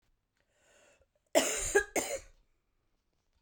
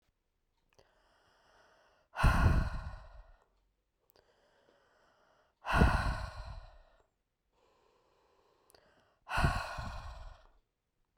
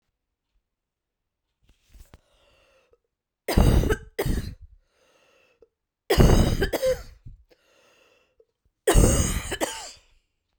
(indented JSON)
{
  "cough_length": "3.4 s",
  "cough_amplitude": 9677,
  "cough_signal_mean_std_ratio": 0.32,
  "exhalation_length": "11.2 s",
  "exhalation_amplitude": 9165,
  "exhalation_signal_mean_std_ratio": 0.33,
  "three_cough_length": "10.6 s",
  "three_cough_amplitude": 23331,
  "three_cough_signal_mean_std_ratio": 0.36,
  "survey_phase": "beta (2021-08-13 to 2022-03-07)",
  "age": "45-64",
  "gender": "Female",
  "wearing_mask": "No",
  "symptom_cough_any": true,
  "symptom_runny_or_blocked_nose": true,
  "symptom_fatigue": true,
  "symptom_loss_of_taste": true,
  "symptom_onset": "3 days",
  "smoker_status": "Never smoked",
  "respiratory_condition_asthma": false,
  "respiratory_condition_other": false,
  "recruitment_source": "Test and Trace",
  "submission_delay": "2 days",
  "covid_test_result": "Positive",
  "covid_test_method": "RT-qPCR",
  "covid_ct_value": 14.8,
  "covid_ct_gene": "ORF1ab gene",
  "covid_ct_mean": 18.0,
  "covid_viral_load": "1300000 copies/ml",
  "covid_viral_load_category": "High viral load (>1M copies/ml)"
}